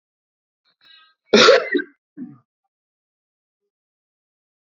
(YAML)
cough_length: 4.6 s
cough_amplitude: 31465
cough_signal_mean_std_ratio: 0.24
survey_phase: beta (2021-08-13 to 2022-03-07)
age: 45-64
gender: Male
wearing_mask: 'No'
symptom_cough_any: true
symptom_runny_or_blocked_nose: true
symptom_shortness_of_breath: true
symptom_diarrhoea: true
symptom_headache: true
symptom_change_to_sense_of_smell_or_taste: true
smoker_status: Never smoked
respiratory_condition_asthma: false
respiratory_condition_other: false
recruitment_source: Test and Trace
submission_delay: 1 day
covid_test_result: Positive
covid_test_method: RT-qPCR